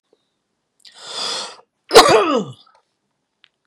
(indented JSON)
{
  "cough_length": "3.7 s",
  "cough_amplitude": 32768,
  "cough_signal_mean_std_ratio": 0.32,
  "survey_phase": "beta (2021-08-13 to 2022-03-07)",
  "age": "45-64",
  "gender": "Male",
  "wearing_mask": "No",
  "symptom_runny_or_blocked_nose": true,
  "smoker_status": "Never smoked",
  "respiratory_condition_asthma": false,
  "respiratory_condition_other": false,
  "recruitment_source": "REACT",
  "submission_delay": "4 days",
  "covid_test_result": "Negative",
  "covid_test_method": "RT-qPCR",
  "influenza_a_test_result": "Negative",
  "influenza_b_test_result": "Negative"
}